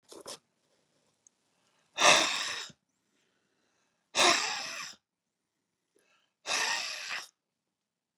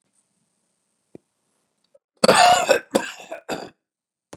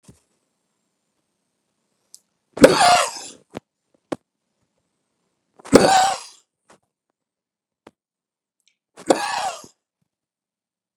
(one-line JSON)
{"exhalation_length": "8.2 s", "exhalation_amplitude": 13602, "exhalation_signal_mean_std_ratio": 0.32, "cough_length": "4.4 s", "cough_amplitude": 31691, "cough_signal_mean_std_ratio": 0.3, "three_cough_length": "11.0 s", "three_cough_amplitude": 32768, "three_cough_signal_mean_std_ratio": 0.24, "survey_phase": "beta (2021-08-13 to 2022-03-07)", "age": "65+", "gender": "Male", "wearing_mask": "No", "symptom_none": true, "smoker_status": "Ex-smoker", "respiratory_condition_asthma": false, "respiratory_condition_other": false, "recruitment_source": "REACT", "submission_delay": "3 days", "covid_test_result": "Negative", "covid_test_method": "RT-qPCR", "influenza_a_test_result": "Negative", "influenza_b_test_result": "Negative"}